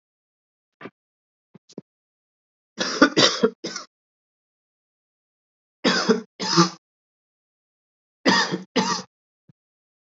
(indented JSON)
{
  "three_cough_length": "10.2 s",
  "three_cough_amplitude": 28289,
  "three_cough_signal_mean_std_ratio": 0.31,
  "survey_phase": "beta (2021-08-13 to 2022-03-07)",
  "age": "18-44",
  "gender": "Male",
  "wearing_mask": "No",
  "symptom_cough_any": true,
  "symptom_runny_or_blocked_nose": true,
  "symptom_onset": "9 days",
  "smoker_status": "Never smoked",
  "respiratory_condition_asthma": false,
  "respiratory_condition_other": false,
  "recruitment_source": "REACT",
  "submission_delay": "4 days",
  "covid_test_result": "Negative",
  "covid_test_method": "RT-qPCR",
  "influenza_a_test_result": "Negative",
  "influenza_b_test_result": "Negative"
}